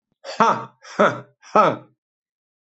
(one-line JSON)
{"exhalation_length": "2.7 s", "exhalation_amplitude": 24878, "exhalation_signal_mean_std_ratio": 0.37, "survey_phase": "beta (2021-08-13 to 2022-03-07)", "age": "45-64", "gender": "Male", "wearing_mask": "No", "symptom_runny_or_blocked_nose": true, "symptom_sore_throat": true, "symptom_change_to_sense_of_smell_or_taste": true, "symptom_loss_of_taste": true, "symptom_onset": "3 days", "smoker_status": "Never smoked", "respiratory_condition_asthma": false, "respiratory_condition_other": false, "recruitment_source": "Test and Trace", "submission_delay": "1 day", "covid_test_result": "Positive", "covid_test_method": "RT-qPCR", "covid_ct_value": 17.5, "covid_ct_gene": "ORF1ab gene", "covid_ct_mean": 17.7, "covid_viral_load": "1600000 copies/ml", "covid_viral_load_category": "High viral load (>1M copies/ml)"}